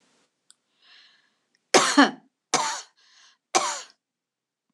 {
  "three_cough_length": "4.7 s",
  "three_cough_amplitude": 25679,
  "three_cough_signal_mean_std_ratio": 0.28,
  "survey_phase": "beta (2021-08-13 to 2022-03-07)",
  "age": "65+",
  "gender": "Female",
  "wearing_mask": "No",
  "symptom_none": true,
  "smoker_status": "Ex-smoker",
  "respiratory_condition_asthma": false,
  "respiratory_condition_other": false,
  "recruitment_source": "REACT",
  "submission_delay": "2 days",
  "covid_test_result": "Negative",
  "covid_test_method": "RT-qPCR",
  "influenza_a_test_result": "Negative",
  "influenza_b_test_result": "Negative"
}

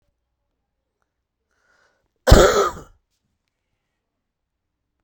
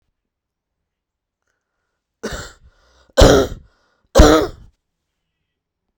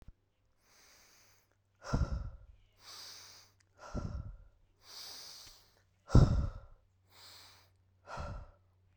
{
  "cough_length": "5.0 s",
  "cough_amplitude": 32768,
  "cough_signal_mean_std_ratio": 0.21,
  "three_cough_length": "6.0 s",
  "three_cough_amplitude": 32768,
  "three_cough_signal_mean_std_ratio": 0.26,
  "exhalation_length": "9.0 s",
  "exhalation_amplitude": 10931,
  "exhalation_signal_mean_std_ratio": 0.27,
  "survey_phase": "beta (2021-08-13 to 2022-03-07)",
  "age": "18-44",
  "gender": "Male",
  "wearing_mask": "No",
  "symptom_cough_any": true,
  "symptom_sore_throat": true,
  "symptom_abdominal_pain": true,
  "symptom_headache": true,
  "symptom_change_to_sense_of_smell_or_taste": true,
  "symptom_loss_of_taste": true,
  "symptom_onset": "5 days",
  "smoker_status": "Never smoked",
  "respiratory_condition_asthma": false,
  "respiratory_condition_other": false,
  "recruitment_source": "Test and Trace",
  "submission_delay": "2 days",
  "covid_test_result": "Positive",
  "covid_test_method": "RT-qPCR",
  "covid_ct_value": 24.0,
  "covid_ct_gene": "N gene"
}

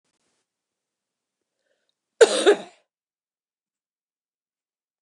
{
  "cough_length": "5.0 s",
  "cough_amplitude": 28255,
  "cough_signal_mean_std_ratio": 0.18,
  "survey_phase": "beta (2021-08-13 to 2022-03-07)",
  "age": "45-64",
  "gender": "Female",
  "wearing_mask": "No",
  "symptom_cough_any": true,
  "symptom_runny_or_blocked_nose": true,
  "symptom_headache": true,
  "smoker_status": "Never smoked",
  "respiratory_condition_asthma": false,
  "respiratory_condition_other": false,
  "recruitment_source": "Test and Trace",
  "submission_delay": "2 days",
  "covid_test_result": "Positive",
  "covid_test_method": "RT-qPCR"
}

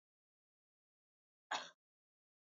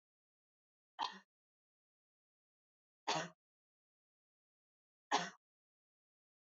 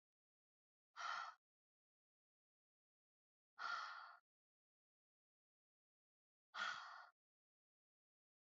{
  "cough_length": "2.6 s",
  "cough_amplitude": 1328,
  "cough_signal_mean_std_ratio": 0.18,
  "three_cough_length": "6.6 s",
  "three_cough_amplitude": 2620,
  "three_cough_signal_mean_std_ratio": 0.2,
  "exhalation_length": "8.5 s",
  "exhalation_amplitude": 636,
  "exhalation_signal_mean_std_ratio": 0.3,
  "survey_phase": "beta (2021-08-13 to 2022-03-07)",
  "age": "18-44",
  "gender": "Female",
  "wearing_mask": "No",
  "symptom_runny_or_blocked_nose": true,
  "symptom_sore_throat": true,
  "smoker_status": "Never smoked",
  "respiratory_condition_asthma": false,
  "respiratory_condition_other": false,
  "recruitment_source": "Test and Trace",
  "submission_delay": "2 days",
  "covid_test_result": "Positive",
  "covid_test_method": "RT-qPCR",
  "covid_ct_value": 25.4,
  "covid_ct_gene": "ORF1ab gene",
  "covid_ct_mean": 25.8,
  "covid_viral_load": "3400 copies/ml",
  "covid_viral_load_category": "Minimal viral load (< 10K copies/ml)"
}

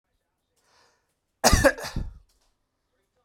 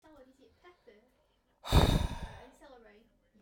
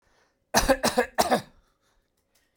{
  "cough_length": "3.2 s",
  "cough_amplitude": 22125,
  "cough_signal_mean_std_ratio": 0.26,
  "exhalation_length": "3.4 s",
  "exhalation_amplitude": 10104,
  "exhalation_signal_mean_std_ratio": 0.3,
  "three_cough_length": "2.6 s",
  "three_cough_amplitude": 19016,
  "three_cough_signal_mean_std_ratio": 0.38,
  "survey_phase": "beta (2021-08-13 to 2022-03-07)",
  "age": "45-64",
  "gender": "Male",
  "wearing_mask": "No",
  "symptom_none": true,
  "smoker_status": "Ex-smoker",
  "respiratory_condition_asthma": false,
  "respiratory_condition_other": false,
  "recruitment_source": "REACT",
  "submission_delay": "8 days",
  "covid_test_result": "Negative",
  "covid_test_method": "RT-qPCR"
}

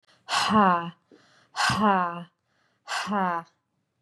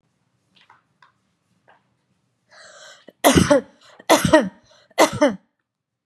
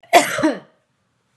{
  "exhalation_length": "4.0 s",
  "exhalation_amplitude": 14808,
  "exhalation_signal_mean_std_ratio": 0.5,
  "three_cough_length": "6.1 s",
  "three_cough_amplitude": 32767,
  "three_cough_signal_mean_std_ratio": 0.3,
  "cough_length": "1.4 s",
  "cough_amplitude": 32768,
  "cough_signal_mean_std_ratio": 0.38,
  "survey_phase": "beta (2021-08-13 to 2022-03-07)",
  "age": "45-64",
  "gender": "Female",
  "wearing_mask": "No",
  "symptom_none": true,
  "smoker_status": "Ex-smoker",
  "respiratory_condition_asthma": false,
  "respiratory_condition_other": false,
  "recruitment_source": "REACT",
  "submission_delay": "1 day",
  "covid_test_result": "Negative",
  "covid_test_method": "RT-qPCR",
  "influenza_a_test_result": "Unknown/Void",
  "influenza_b_test_result": "Unknown/Void"
}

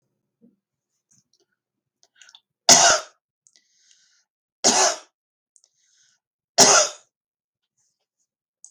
{
  "three_cough_length": "8.7 s",
  "three_cough_amplitude": 32768,
  "three_cough_signal_mean_std_ratio": 0.25,
  "survey_phase": "beta (2021-08-13 to 2022-03-07)",
  "age": "65+",
  "gender": "Female",
  "wearing_mask": "No",
  "symptom_cough_any": true,
  "symptom_onset": "6 days",
  "smoker_status": "Never smoked",
  "respiratory_condition_asthma": false,
  "respiratory_condition_other": false,
  "recruitment_source": "REACT",
  "submission_delay": "5 days",
  "covid_test_result": "Negative",
  "covid_test_method": "RT-qPCR",
  "influenza_a_test_result": "Negative",
  "influenza_b_test_result": "Negative"
}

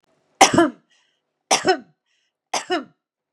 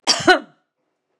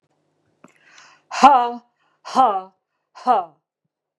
{
  "three_cough_length": "3.3 s",
  "three_cough_amplitude": 32768,
  "three_cough_signal_mean_std_ratio": 0.32,
  "cough_length": "1.2 s",
  "cough_amplitude": 32767,
  "cough_signal_mean_std_ratio": 0.34,
  "exhalation_length": "4.2 s",
  "exhalation_amplitude": 32768,
  "exhalation_signal_mean_std_ratio": 0.33,
  "survey_phase": "beta (2021-08-13 to 2022-03-07)",
  "age": "45-64",
  "gender": "Female",
  "wearing_mask": "No",
  "symptom_none": true,
  "smoker_status": "Never smoked",
  "respiratory_condition_asthma": false,
  "respiratory_condition_other": false,
  "recruitment_source": "Test and Trace",
  "submission_delay": "0 days",
  "covid_test_result": "Negative",
  "covid_test_method": "LFT"
}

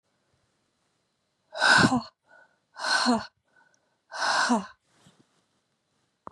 {
  "exhalation_length": "6.3 s",
  "exhalation_amplitude": 14375,
  "exhalation_signal_mean_std_ratio": 0.36,
  "survey_phase": "beta (2021-08-13 to 2022-03-07)",
  "age": "45-64",
  "gender": "Female",
  "wearing_mask": "No",
  "symptom_cough_any": true,
  "symptom_runny_or_blocked_nose": true,
  "symptom_sore_throat": true,
  "symptom_abdominal_pain": true,
  "symptom_fatigue": true,
  "symptom_headache": true,
  "smoker_status": "Ex-smoker",
  "respiratory_condition_asthma": false,
  "respiratory_condition_other": false,
  "recruitment_source": "Test and Trace",
  "submission_delay": "2 days",
  "covid_test_result": "Positive",
  "covid_test_method": "LFT"
}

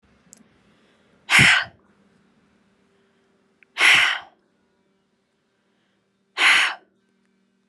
{
  "exhalation_length": "7.7 s",
  "exhalation_amplitude": 27667,
  "exhalation_signal_mean_std_ratio": 0.3,
  "survey_phase": "alpha (2021-03-01 to 2021-08-12)",
  "age": "18-44",
  "gender": "Female",
  "wearing_mask": "No",
  "symptom_none": true,
  "smoker_status": "Never smoked",
  "respiratory_condition_asthma": false,
  "respiratory_condition_other": false,
  "recruitment_source": "REACT",
  "submission_delay": "3 days",
  "covid_test_result": "Negative",
  "covid_test_method": "RT-qPCR"
}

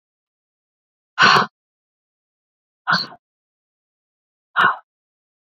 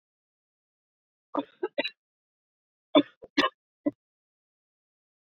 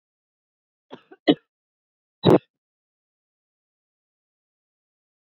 {
  "exhalation_length": "5.5 s",
  "exhalation_amplitude": 27663,
  "exhalation_signal_mean_std_ratio": 0.25,
  "three_cough_length": "5.3 s",
  "three_cough_amplitude": 17394,
  "three_cough_signal_mean_std_ratio": 0.2,
  "cough_length": "5.2 s",
  "cough_amplitude": 27342,
  "cough_signal_mean_std_ratio": 0.15,
  "survey_phase": "beta (2021-08-13 to 2022-03-07)",
  "age": "45-64",
  "gender": "Female",
  "wearing_mask": "No",
  "symptom_cough_any": true,
  "symptom_runny_or_blocked_nose": true,
  "symptom_loss_of_taste": true,
  "smoker_status": "Never smoked",
  "respiratory_condition_asthma": false,
  "respiratory_condition_other": false,
  "recruitment_source": "Test and Trace",
  "submission_delay": "1 day",
  "covid_test_result": "Positive",
  "covid_test_method": "RT-qPCR",
  "covid_ct_value": 17.1,
  "covid_ct_gene": "ORF1ab gene",
  "covid_ct_mean": 17.5,
  "covid_viral_load": "1800000 copies/ml",
  "covid_viral_load_category": "High viral load (>1M copies/ml)"
}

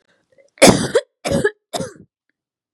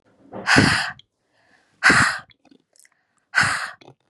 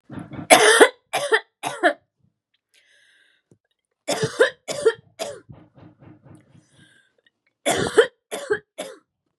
{
  "cough_length": "2.7 s",
  "cough_amplitude": 32768,
  "cough_signal_mean_std_ratio": 0.34,
  "exhalation_length": "4.1 s",
  "exhalation_amplitude": 30301,
  "exhalation_signal_mean_std_ratio": 0.41,
  "three_cough_length": "9.4 s",
  "three_cough_amplitude": 32768,
  "three_cough_signal_mean_std_ratio": 0.33,
  "survey_phase": "beta (2021-08-13 to 2022-03-07)",
  "age": "18-44",
  "gender": "Female",
  "wearing_mask": "No",
  "symptom_cough_any": true,
  "symptom_new_continuous_cough": true,
  "symptom_runny_or_blocked_nose": true,
  "symptom_sore_throat": true,
  "symptom_abdominal_pain": true,
  "symptom_fatigue": true,
  "symptom_headache": true,
  "symptom_onset": "3 days",
  "smoker_status": "Never smoked",
  "respiratory_condition_asthma": false,
  "respiratory_condition_other": false,
  "recruitment_source": "Test and Trace",
  "submission_delay": "2 days",
  "covid_test_result": "Positive",
  "covid_test_method": "RT-qPCR",
  "covid_ct_value": 22.9,
  "covid_ct_gene": "N gene"
}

